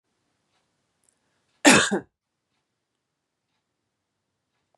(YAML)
cough_length: 4.8 s
cough_amplitude: 31246
cough_signal_mean_std_ratio: 0.19
survey_phase: beta (2021-08-13 to 2022-03-07)
age: 45-64
gender: Female
wearing_mask: 'No'
symptom_none: true
smoker_status: Ex-smoker
respiratory_condition_asthma: false
respiratory_condition_other: false
recruitment_source: REACT
submission_delay: 1 day
covid_test_result: Negative
covid_test_method: RT-qPCR
influenza_a_test_result: Negative
influenza_b_test_result: Negative